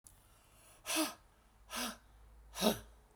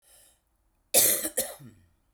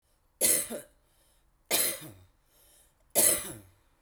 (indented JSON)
{
  "exhalation_length": "3.2 s",
  "exhalation_amplitude": 4833,
  "exhalation_signal_mean_std_ratio": 0.4,
  "cough_length": "2.1 s",
  "cough_amplitude": 21112,
  "cough_signal_mean_std_ratio": 0.35,
  "three_cough_length": "4.0 s",
  "three_cough_amplitude": 12541,
  "three_cough_signal_mean_std_ratio": 0.38,
  "survey_phase": "beta (2021-08-13 to 2022-03-07)",
  "age": "45-64",
  "gender": "Female",
  "wearing_mask": "No",
  "symptom_fatigue": true,
  "smoker_status": "Ex-smoker",
  "respiratory_condition_asthma": true,
  "respiratory_condition_other": false,
  "recruitment_source": "REACT",
  "submission_delay": "5 days",
  "covid_test_result": "Negative",
  "covid_test_method": "RT-qPCR"
}